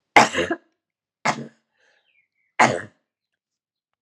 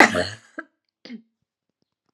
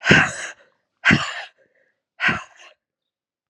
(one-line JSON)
{"three_cough_length": "4.0 s", "three_cough_amplitude": 32768, "three_cough_signal_mean_std_ratio": 0.26, "cough_length": "2.1 s", "cough_amplitude": 32768, "cough_signal_mean_std_ratio": 0.24, "exhalation_length": "3.5 s", "exhalation_amplitude": 32694, "exhalation_signal_mean_std_ratio": 0.35, "survey_phase": "alpha (2021-03-01 to 2021-08-12)", "age": "18-44", "gender": "Female", "wearing_mask": "No", "symptom_cough_any": true, "symptom_fatigue": true, "smoker_status": "Never smoked", "respiratory_condition_asthma": false, "respiratory_condition_other": false, "recruitment_source": "Test and Trace", "submission_delay": "3 days", "covid_test_result": "Positive", "covid_test_method": "RT-qPCR", "covid_ct_value": 19.8, "covid_ct_gene": "ORF1ab gene", "covid_ct_mean": 20.1, "covid_viral_load": "250000 copies/ml", "covid_viral_load_category": "Low viral load (10K-1M copies/ml)"}